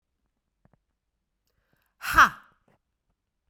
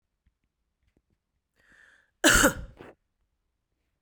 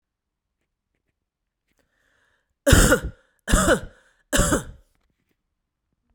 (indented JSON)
{
  "exhalation_length": "3.5 s",
  "exhalation_amplitude": 19599,
  "exhalation_signal_mean_std_ratio": 0.16,
  "cough_length": "4.0 s",
  "cough_amplitude": 17474,
  "cough_signal_mean_std_ratio": 0.23,
  "three_cough_length": "6.1 s",
  "three_cough_amplitude": 31583,
  "three_cough_signal_mean_std_ratio": 0.31,
  "survey_phase": "beta (2021-08-13 to 2022-03-07)",
  "age": "45-64",
  "gender": "Female",
  "wearing_mask": "No",
  "symptom_none": true,
  "symptom_onset": "9 days",
  "smoker_status": "Never smoked",
  "respiratory_condition_asthma": false,
  "respiratory_condition_other": false,
  "recruitment_source": "REACT",
  "submission_delay": "3 days",
  "covid_test_result": "Negative",
  "covid_test_method": "RT-qPCR"
}